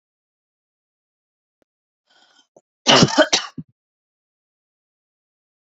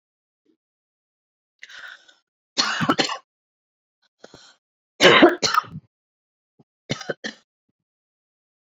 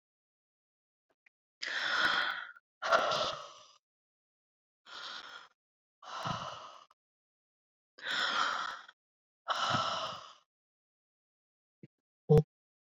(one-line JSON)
{"cough_length": "5.7 s", "cough_amplitude": 32768, "cough_signal_mean_std_ratio": 0.21, "three_cough_length": "8.8 s", "three_cough_amplitude": 32145, "three_cough_signal_mean_std_ratio": 0.25, "exhalation_length": "12.9 s", "exhalation_amplitude": 7235, "exhalation_signal_mean_std_ratio": 0.38, "survey_phase": "beta (2021-08-13 to 2022-03-07)", "age": "45-64", "gender": "Female", "wearing_mask": "No", "symptom_none": true, "smoker_status": "Ex-smoker", "respiratory_condition_asthma": false, "respiratory_condition_other": false, "recruitment_source": "REACT", "submission_delay": "4 days", "covid_test_result": "Negative", "covid_test_method": "RT-qPCR"}